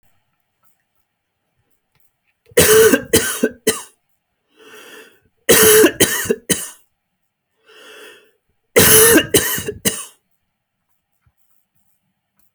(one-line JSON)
{"three_cough_length": "12.5 s", "three_cough_amplitude": 32768, "three_cough_signal_mean_std_ratio": 0.36, "survey_phase": "beta (2021-08-13 to 2022-03-07)", "age": "45-64", "gender": "Male", "wearing_mask": "No", "symptom_none": true, "smoker_status": "Never smoked", "respiratory_condition_asthma": false, "respiratory_condition_other": false, "recruitment_source": "REACT", "submission_delay": "3 days", "covid_test_result": "Negative", "covid_test_method": "RT-qPCR"}